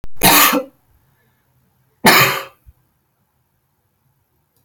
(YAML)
cough_length: 4.6 s
cough_amplitude: 32768
cough_signal_mean_std_ratio: 0.36
survey_phase: alpha (2021-03-01 to 2021-08-12)
age: 45-64
gender: Female
wearing_mask: 'No'
symptom_none: true
smoker_status: Ex-smoker
respiratory_condition_asthma: false
respiratory_condition_other: false
recruitment_source: REACT
submission_delay: 1 day
covid_test_result: Negative
covid_test_method: RT-qPCR